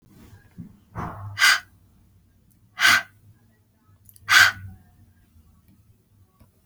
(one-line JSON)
{"exhalation_length": "6.7 s", "exhalation_amplitude": 30302, "exhalation_signal_mean_std_ratio": 0.29, "survey_phase": "beta (2021-08-13 to 2022-03-07)", "age": "18-44", "gender": "Female", "wearing_mask": "No", "symptom_none": true, "symptom_onset": "8 days", "smoker_status": "Never smoked", "respiratory_condition_asthma": false, "respiratory_condition_other": false, "recruitment_source": "REACT", "submission_delay": "6 days", "covid_test_result": "Negative", "covid_test_method": "RT-qPCR"}